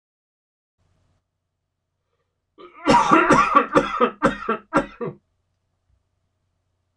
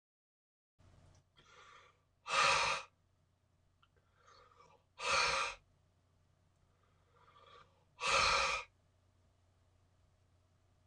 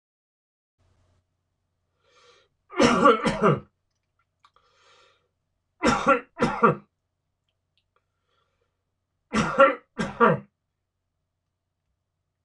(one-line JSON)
{"cough_length": "7.0 s", "cough_amplitude": 26028, "cough_signal_mean_std_ratio": 0.36, "exhalation_length": "10.9 s", "exhalation_amplitude": 3795, "exhalation_signal_mean_std_ratio": 0.34, "three_cough_length": "12.4 s", "three_cough_amplitude": 23300, "three_cough_signal_mean_std_ratio": 0.3, "survey_phase": "beta (2021-08-13 to 2022-03-07)", "age": "45-64", "gender": "Male", "wearing_mask": "No", "symptom_none": true, "smoker_status": "Ex-smoker", "respiratory_condition_asthma": false, "respiratory_condition_other": false, "recruitment_source": "REACT", "submission_delay": "1 day", "covid_test_result": "Negative", "covid_test_method": "RT-qPCR", "influenza_a_test_result": "Negative", "influenza_b_test_result": "Negative"}